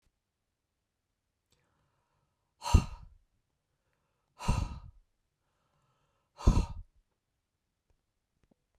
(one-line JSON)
{"exhalation_length": "8.8 s", "exhalation_amplitude": 12571, "exhalation_signal_mean_std_ratio": 0.19, "survey_phase": "beta (2021-08-13 to 2022-03-07)", "age": "45-64", "gender": "Female", "wearing_mask": "No", "symptom_none": true, "symptom_onset": "12 days", "smoker_status": "Never smoked", "respiratory_condition_asthma": false, "respiratory_condition_other": false, "recruitment_source": "REACT", "submission_delay": "2 days", "covid_test_result": "Negative", "covid_test_method": "RT-qPCR"}